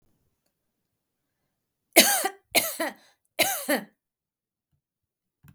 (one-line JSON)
{"three_cough_length": "5.5 s", "three_cough_amplitude": 32768, "three_cough_signal_mean_std_ratio": 0.28, "survey_phase": "beta (2021-08-13 to 2022-03-07)", "age": "18-44", "gender": "Female", "wearing_mask": "No", "symptom_none": true, "smoker_status": "Never smoked", "respiratory_condition_asthma": false, "respiratory_condition_other": false, "recruitment_source": "REACT", "submission_delay": "1 day", "covid_test_result": "Negative", "covid_test_method": "RT-qPCR", "influenza_a_test_result": "Negative", "influenza_b_test_result": "Negative"}